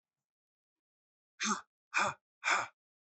{"exhalation_length": "3.2 s", "exhalation_amplitude": 4412, "exhalation_signal_mean_std_ratio": 0.33, "survey_phase": "alpha (2021-03-01 to 2021-08-12)", "age": "45-64", "gender": "Male", "wearing_mask": "No", "symptom_none": true, "smoker_status": "Ex-smoker", "respiratory_condition_asthma": false, "respiratory_condition_other": false, "recruitment_source": "REACT", "submission_delay": "2 days", "covid_test_result": "Negative", "covid_test_method": "RT-qPCR"}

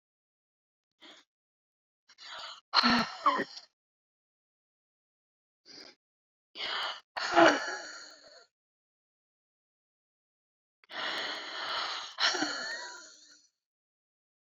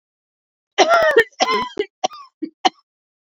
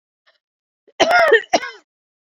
{"exhalation_length": "14.6 s", "exhalation_amplitude": 12654, "exhalation_signal_mean_std_ratio": 0.33, "three_cough_length": "3.2 s", "three_cough_amplitude": 28998, "three_cough_signal_mean_std_ratio": 0.41, "cough_length": "2.4 s", "cough_amplitude": 32762, "cough_signal_mean_std_ratio": 0.37, "survey_phase": "beta (2021-08-13 to 2022-03-07)", "age": "18-44", "gender": "Female", "wearing_mask": "No", "symptom_cough_any": true, "symptom_runny_or_blocked_nose": true, "smoker_status": "Ex-smoker", "respiratory_condition_asthma": true, "respiratory_condition_other": true, "recruitment_source": "REACT", "submission_delay": "2 days", "covid_test_result": "Negative", "covid_test_method": "RT-qPCR"}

